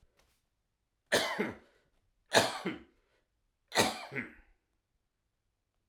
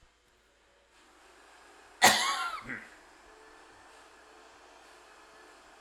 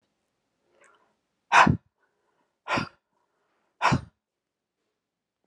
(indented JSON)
{
  "three_cough_length": "5.9 s",
  "three_cough_amplitude": 11432,
  "three_cough_signal_mean_std_ratio": 0.31,
  "cough_length": "5.8 s",
  "cough_amplitude": 20217,
  "cough_signal_mean_std_ratio": 0.27,
  "exhalation_length": "5.5 s",
  "exhalation_amplitude": 19137,
  "exhalation_signal_mean_std_ratio": 0.23,
  "survey_phase": "alpha (2021-03-01 to 2021-08-12)",
  "age": "65+",
  "gender": "Male",
  "wearing_mask": "No",
  "symptom_fatigue": true,
  "symptom_onset": "4 days",
  "smoker_status": "Ex-smoker",
  "respiratory_condition_asthma": false,
  "respiratory_condition_other": false,
  "recruitment_source": "Test and Trace",
  "submission_delay": "2 days",
  "covid_test_result": "Positive",
  "covid_test_method": "RT-qPCR"
}